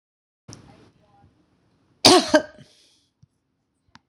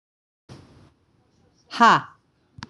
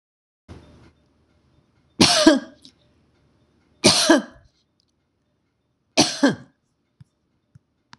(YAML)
cough_length: 4.1 s
cough_amplitude: 26028
cough_signal_mean_std_ratio: 0.21
exhalation_length: 2.7 s
exhalation_amplitude: 25357
exhalation_signal_mean_std_ratio: 0.24
three_cough_length: 8.0 s
three_cough_amplitude: 26028
three_cough_signal_mean_std_ratio: 0.28
survey_phase: beta (2021-08-13 to 2022-03-07)
age: 65+
gender: Female
wearing_mask: 'No'
symptom_none: true
smoker_status: Ex-smoker
respiratory_condition_asthma: false
respiratory_condition_other: false
recruitment_source: REACT
submission_delay: 4 days
covid_test_result: Negative
covid_test_method: RT-qPCR
influenza_a_test_result: Negative
influenza_b_test_result: Negative